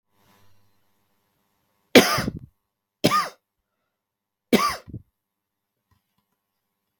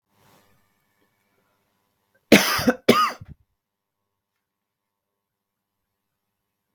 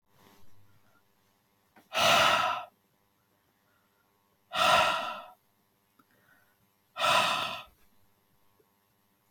{
  "three_cough_length": "7.0 s",
  "three_cough_amplitude": 32768,
  "three_cough_signal_mean_std_ratio": 0.23,
  "cough_length": "6.7 s",
  "cough_amplitude": 32766,
  "cough_signal_mean_std_ratio": 0.21,
  "exhalation_length": "9.3 s",
  "exhalation_amplitude": 9805,
  "exhalation_signal_mean_std_ratio": 0.37,
  "survey_phase": "beta (2021-08-13 to 2022-03-07)",
  "age": "45-64",
  "gender": "Male",
  "wearing_mask": "No",
  "symptom_none": true,
  "smoker_status": "Never smoked",
  "respiratory_condition_asthma": false,
  "respiratory_condition_other": false,
  "recruitment_source": "REACT",
  "submission_delay": "2 days",
  "covid_test_result": "Negative",
  "covid_test_method": "RT-qPCR"
}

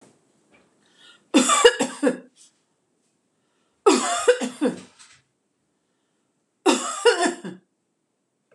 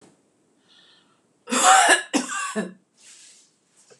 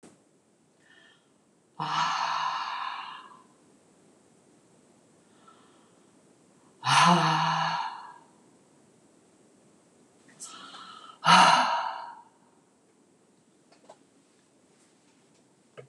{
  "three_cough_length": "8.5 s",
  "three_cough_amplitude": 26028,
  "three_cough_signal_mean_std_ratio": 0.35,
  "cough_length": "4.0 s",
  "cough_amplitude": 24268,
  "cough_signal_mean_std_ratio": 0.37,
  "exhalation_length": "15.9 s",
  "exhalation_amplitude": 17112,
  "exhalation_signal_mean_std_ratio": 0.33,
  "survey_phase": "beta (2021-08-13 to 2022-03-07)",
  "age": "45-64",
  "gender": "Female",
  "wearing_mask": "No",
  "symptom_none": true,
  "smoker_status": "Ex-smoker",
  "respiratory_condition_asthma": false,
  "respiratory_condition_other": false,
  "recruitment_source": "REACT",
  "submission_delay": "2 days",
  "covid_test_result": "Negative",
  "covid_test_method": "RT-qPCR"
}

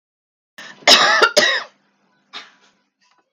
{
  "cough_length": "3.3 s",
  "cough_amplitude": 32768,
  "cough_signal_mean_std_ratio": 0.37,
  "survey_phase": "beta (2021-08-13 to 2022-03-07)",
  "age": "45-64",
  "gender": "Female",
  "wearing_mask": "No",
  "symptom_none": true,
  "smoker_status": "Never smoked",
  "respiratory_condition_asthma": false,
  "respiratory_condition_other": false,
  "recruitment_source": "REACT",
  "submission_delay": "7 days",
  "covid_test_result": "Negative",
  "covid_test_method": "RT-qPCR",
  "influenza_a_test_result": "Negative",
  "influenza_b_test_result": "Negative"
}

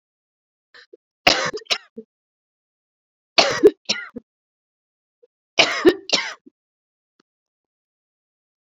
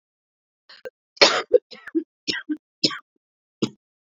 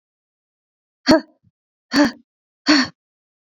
{
  "three_cough_length": "8.7 s",
  "three_cough_amplitude": 29346,
  "three_cough_signal_mean_std_ratio": 0.25,
  "cough_length": "4.2 s",
  "cough_amplitude": 30136,
  "cough_signal_mean_std_ratio": 0.27,
  "exhalation_length": "3.5 s",
  "exhalation_amplitude": 27603,
  "exhalation_signal_mean_std_ratio": 0.29,
  "survey_phase": "beta (2021-08-13 to 2022-03-07)",
  "age": "18-44",
  "gender": "Female",
  "wearing_mask": "No",
  "symptom_cough_any": true,
  "symptom_runny_or_blocked_nose": true,
  "symptom_shortness_of_breath": true,
  "symptom_sore_throat": true,
  "symptom_fatigue": true,
  "symptom_headache": true,
  "smoker_status": "Never smoked",
  "respiratory_condition_asthma": true,
  "respiratory_condition_other": false,
  "recruitment_source": "Test and Trace",
  "submission_delay": "1 day",
  "covid_test_result": "Positive",
  "covid_test_method": "RT-qPCR",
  "covid_ct_value": 13.4,
  "covid_ct_gene": "ORF1ab gene"
}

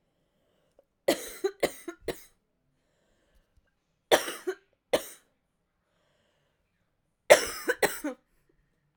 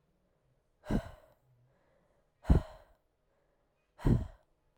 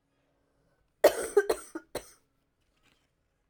{
  "three_cough_length": "9.0 s",
  "three_cough_amplitude": 26343,
  "three_cough_signal_mean_std_ratio": 0.23,
  "exhalation_length": "4.8 s",
  "exhalation_amplitude": 7568,
  "exhalation_signal_mean_std_ratio": 0.25,
  "cough_length": "3.5 s",
  "cough_amplitude": 14411,
  "cough_signal_mean_std_ratio": 0.23,
  "survey_phase": "alpha (2021-03-01 to 2021-08-12)",
  "age": "18-44",
  "gender": "Female",
  "wearing_mask": "No",
  "symptom_cough_any": true,
  "symptom_new_continuous_cough": true,
  "symptom_shortness_of_breath": true,
  "symptom_fatigue": true,
  "symptom_fever_high_temperature": true,
  "symptom_headache": true,
  "symptom_change_to_sense_of_smell_or_taste": true,
  "symptom_loss_of_taste": true,
  "symptom_onset": "4 days",
  "smoker_status": "Never smoked",
  "respiratory_condition_asthma": true,
  "respiratory_condition_other": false,
  "recruitment_source": "Test and Trace",
  "submission_delay": "2 days",
  "covid_test_result": "Positive",
  "covid_test_method": "RT-qPCR",
  "covid_ct_value": 23.1,
  "covid_ct_gene": "ORF1ab gene",
  "covid_ct_mean": 23.4,
  "covid_viral_load": "21000 copies/ml",
  "covid_viral_load_category": "Low viral load (10K-1M copies/ml)"
}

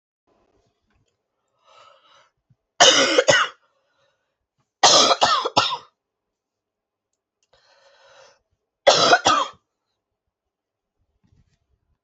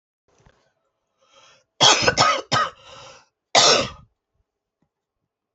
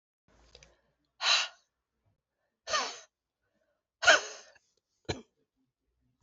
{
  "three_cough_length": "12.0 s",
  "three_cough_amplitude": 32767,
  "three_cough_signal_mean_std_ratio": 0.31,
  "cough_length": "5.5 s",
  "cough_amplitude": 32767,
  "cough_signal_mean_std_ratio": 0.34,
  "exhalation_length": "6.2 s",
  "exhalation_amplitude": 15138,
  "exhalation_signal_mean_std_ratio": 0.24,
  "survey_phase": "alpha (2021-03-01 to 2021-08-12)",
  "age": "45-64",
  "gender": "Female",
  "wearing_mask": "No",
  "symptom_cough_any": true,
  "symptom_shortness_of_breath": true,
  "symptom_fatigue": true,
  "symptom_headache": true,
  "symptom_change_to_sense_of_smell_or_taste": true,
  "symptom_onset": "3 days",
  "smoker_status": "Prefer not to say",
  "respiratory_condition_asthma": true,
  "respiratory_condition_other": false,
  "recruitment_source": "Test and Trace",
  "submission_delay": "2 days",
  "covid_test_result": "Positive",
  "covid_test_method": "RT-qPCR",
  "covid_ct_value": 11.6,
  "covid_ct_gene": "ORF1ab gene",
  "covid_ct_mean": 11.8,
  "covid_viral_load": "130000000 copies/ml",
  "covid_viral_load_category": "High viral load (>1M copies/ml)"
}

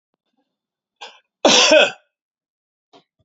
{
  "cough_length": "3.2 s",
  "cough_amplitude": 32026,
  "cough_signal_mean_std_ratio": 0.31,
  "survey_phase": "beta (2021-08-13 to 2022-03-07)",
  "age": "65+",
  "gender": "Male",
  "wearing_mask": "No",
  "symptom_headache": true,
  "symptom_onset": "12 days",
  "smoker_status": "Ex-smoker",
  "respiratory_condition_asthma": false,
  "respiratory_condition_other": false,
  "recruitment_source": "REACT",
  "submission_delay": "28 days",
  "covid_test_result": "Negative",
  "covid_test_method": "RT-qPCR",
  "influenza_a_test_result": "Negative",
  "influenza_b_test_result": "Negative"
}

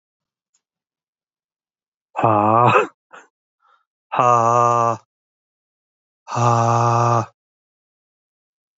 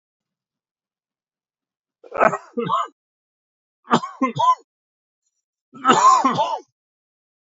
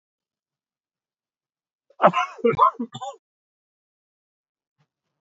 {
  "exhalation_length": "8.8 s",
  "exhalation_amplitude": 27605,
  "exhalation_signal_mean_std_ratio": 0.43,
  "three_cough_length": "7.6 s",
  "three_cough_amplitude": 28187,
  "three_cough_signal_mean_std_ratio": 0.35,
  "cough_length": "5.2 s",
  "cough_amplitude": 29165,
  "cough_signal_mean_std_ratio": 0.24,
  "survey_phase": "beta (2021-08-13 to 2022-03-07)",
  "age": "45-64",
  "gender": "Male",
  "wearing_mask": "No",
  "symptom_cough_any": true,
  "symptom_new_continuous_cough": true,
  "symptom_runny_or_blocked_nose": true,
  "symptom_fatigue": true,
  "symptom_headache": true,
  "smoker_status": "Ex-smoker",
  "respiratory_condition_asthma": false,
  "respiratory_condition_other": false,
  "recruitment_source": "Test and Trace",
  "submission_delay": "2 days",
  "covid_test_result": "Positive",
  "covid_test_method": "RT-qPCR",
  "covid_ct_value": 26.9,
  "covid_ct_gene": "ORF1ab gene",
  "covid_ct_mean": 28.0,
  "covid_viral_load": "670 copies/ml",
  "covid_viral_load_category": "Minimal viral load (< 10K copies/ml)"
}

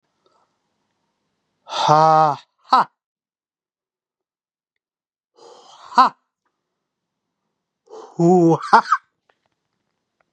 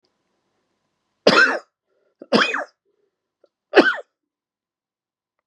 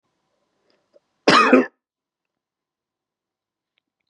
{
  "exhalation_length": "10.3 s",
  "exhalation_amplitude": 32424,
  "exhalation_signal_mean_std_ratio": 0.29,
  "three_cough_length": "5.5 s",
  "three_cough_amplitude": 32767,
  "three_cough_signal_mean_std_ratio": 0.28,
  "cough_length": "4.1 s",
  "cough_amplitude": 30849,
  "cough_signal_mean_std_ratio": 0.24,
  "survey_phase": "beta (2021-08-13 to 2022-03-07)",
  "age": "45-64",
  "gender": "Male",
  "wearing_mask": "No",
  "symptom_new_continuous_cough": true,
  "symptom_runny_or_blocked_nose": true,
  "symptom_fatigue": true,
  "symptom_change_to_sense_of_smell_or_taste": true,
  "symptom_loss_of_taste": true,
  "symptom_onset": "3 days",
  "smoker_status": "Never smoked",
  "respiratory_condition_asthma": true,
  "respiratory_condition_other": false,
  "recruitment_source": "Test and Trace",
  "submission_delay": "2 days",
  "covid_test_result": "Positive",
  "covid_test_method": "RT-qPCR",
  "covid_ct_value": 16.7,
  "covid_ct_gene": "ORF1ab gene",
  "covid_ct_mean": 17.0,
  "covid_viral_load": "2800000 copies/ml",
  "covid_viral_load_category": "High viral load (>1M copies/ml)"
}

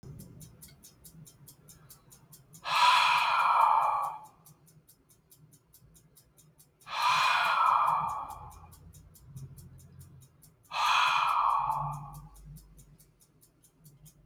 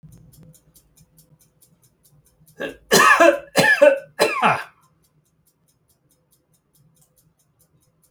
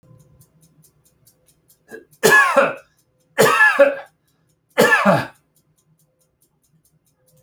{
  "exhalation_length": "14.3 s",
  "exhalation_amplitude": 8958,
  "exhalation_signal_mean_std_ratio": 0.5,
  "cough_length": "8.1 s",
  "cough_amplitude": 30160,
  "cough_signal_mean_std_ratio": 0.32,
  "three_cough_length": "7.4 s",
  "three_cough_amplitude": 31049,
  "three_cough_signal_mean_std_ratio": 0.37,
  "survey_phase": "alpha (2021-03-01 to 2021-08-12)",
  "age": "45-64",
  "gender": "Male",
  "wearing_mask": "No",
  "symptom_none": true,
  "symptom_onset": "7 days",
  "smoker_status": "Never smoked",
  "respiratory_condition_asthma": false,
  "respiratory_condition_other": false,
  "recruitment_source": "REACT",
  "submission_delay": "1 day",
  "covid_test_result": "Negative",
  "covid_test_method": "RT-qPCR"
}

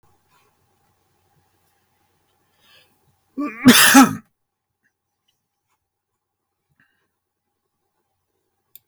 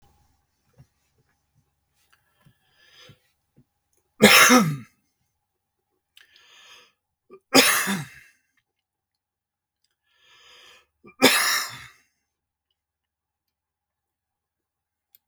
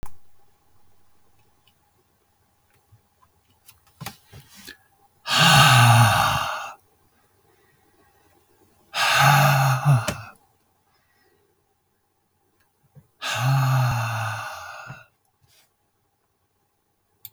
{
  "cough_length": "8.9 s",
  "cough_amplitude": 32768,
  "cough_signal_mean_std_ratio": 0.19,
  "three_cough_length": "15.3 s",
  "three_cough_amplitude": 32768,
  "three_cough_signal_mean_std_ratio": 0.23,
  "exhalation_length": "17.3 s",
  "exhalation_amplitude": 28296,
  "exhalation_signal_mean_std_ratio": 0.39,
  "survey_phase": "beta (2021-08-13 to 2022-03-07)",
  "age": "65+",
  "gender": "Male",
  "wearing_mask": "No",
  "symptom_none": true,
  "smoker_status": "Never smoked",
  "respiratory_condition_asthma": false,
  "respiratory_condition_other": false,
  "recruitment_source": "REACT",
  "submission_delay": "2 days",
  "covid_test_result": "Negative",
  "covid_test_method": "RT-qPCR",
  "influenza_a_test_result": "Negative",
  "influenza_b_test_result": "Negative"
}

